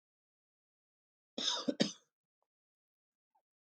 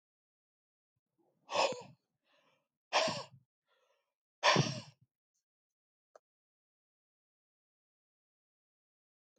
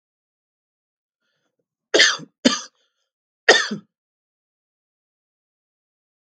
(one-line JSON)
{"cough_length": "3.8 s", "cough_amplitude": 6907, "cough_signal_mean_std_ratio": 0.23, "exhalation_length": "9.4 s", "exhalation_amplitude": 5594, "exhalation_signal_mean_std_ratio": 0.22, "three_cough_length": "6.2 s", "three_cough_amplitude": 32768, "three_cough_signal_mean_std_ratio": 0.22, "survey_phase": "beta (2021-08-13 to 2022-03-07)", "age": "65+", "gender": "Male", "wearing_mask": "No", "symptom_runny_or_blocked_nose": true, "symptom_diarrhoea": true, "smoker_status": "Never smoked", "respiratory_condition_asthma": false, "respiratory_condition_other": false, "recruitment_source": "REACT", "submission_delay": "1 day", "covid_test_result": "Negative", "covid_test_method": "RT-qPCR", "influenza_a_test_result": "Negative", "influenza_b_test_result": "Negative"}